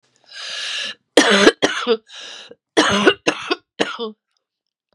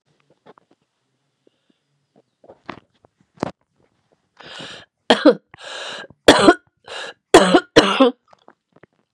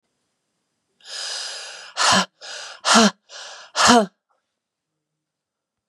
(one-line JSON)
{"cough_length": "4.9 s", "cough_amplitude": 32768, "cough_signal_mean_std_ratio": 0.44, "three_cough_length": "9.1 s", "three_cough_amplitude": 32768, "three_cough_signal_mean_std_ratio": 0.27, "exhalation_length": "5.9 s", "exhalation_amplitude": 29381, "exhalation_signal_mean_std_ratio": 0.35, "survey_phase": "beta (2021-08-13 to 2022-03-07)", "age": "45-64", "gender": "Female", "wearing_mask": "No", "symptom_cough_any": true, "symptom_runny_or_blocked_nose": true, "symptom_fatigue": true, "symptom_other": true, "smoker_status": "Ex-smoker", "respiratory_condition_asthma": true, "respiratory_condition_other": false, "recruitment_source": "Test and Trace", "submission_delay": "2 days", "covid_test_result": "Positive", "covid_test_method": "LFT"}